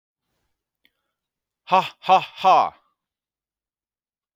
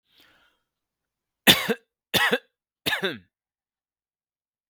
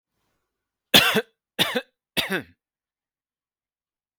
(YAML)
exhalation_length: 4.4 s
exhalation_amplitude: 23629
exhalation_signal_mean_std_ratio: 0.27
three_cough_length: 4.7 s
three_cough_amplitude: 32768
three_cough_signal_mean_std_ratio: 0.27
cough_length: 4.2 s
cough_amplitude: 32768
cough_signal_mean_std_ratio: 0.27
survey_phase: beta (2021-08-13 to 2022-03-07)
age: 45-64
gender: Male
wearing_mask: 'No'
symptom_none: true
smoker_status: Ex-smoker
respiratory_condition_asthma: false
respiratory_condition_other: false
recruitment_source: REACT
submission_delay: 2 days
covid_test_result: Negative
covid_test_method: RT-qPCR
influenza_a_test_result: Negative
influenza_b_test_result: Negative